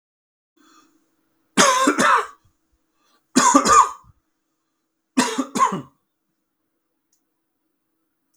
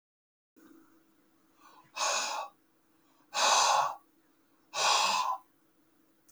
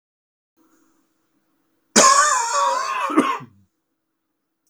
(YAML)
three_cough_length: 8.4 s
three_cough_amplitude: 31727
three_cough_signal_mean_std_ratio: 0.35
exhalation_length: 6.3 s
exhalation_amplitude: 7664
exhalation_signal_mean_std_ratio: 0.44
cough_length: 4.7 s
cough_amplitude: 32768
cough_signal_mean_std_ratio: 0.42
survey_phase: beta (2021-08-13 to 2022-03-07)
age: 65+
gender: Male
wearing_mask: 'No'
symptom_cough_any: true
symptom_runny_or_blocked_nose: true
symptom_sore_throat: true
symptom_diarrhoea: true
symptom_fatigue: true
symptom_fever_high_temperature: true
symptom_other: true
symptom_onset: 2 days
smoker_status: Ex-smoker
respiratory_condition_asthma: false
respiratory_condition_other: false
recruitment_source: Test and Trace
submission_delay: 1 day
covid_test_result: Positive
covid_test_method: RT-qPCR
covid_ct_value: 12.6
covid_ct_gene: ORF1ab gene
covid_ct_mean: 12.9
covid_viral_load: 60000000 copies/ml
covid_viral_load_category: High viral load (>1M copies/ml)